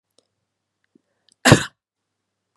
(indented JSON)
{
  "cough_length": "2.6 s",
  "cough_amplitude": 32768,
  "cough_signal_mean_std_ratio": 0.18,
  "survey_phase": "beta (2021-08-13 to 2022-03-07)",
  "age": "45-64",
  "gender": "Female",
  "wearing_mask": "No",
  "symptom_none": true,
  "smoker_status": "Ex-smoker",
  "respiratory_condition_asthma": false,
  "respiratory_condition_other": false,
  "recruitment_source": "REACT",
  "submission_delay": "2 days",
  "covid_test_result": "Negative",
  "covid_test_method": "RT-qPCR",
  "influenza_a_test_result": "Negative",
  "influenza_b_test_result": "Negative"
}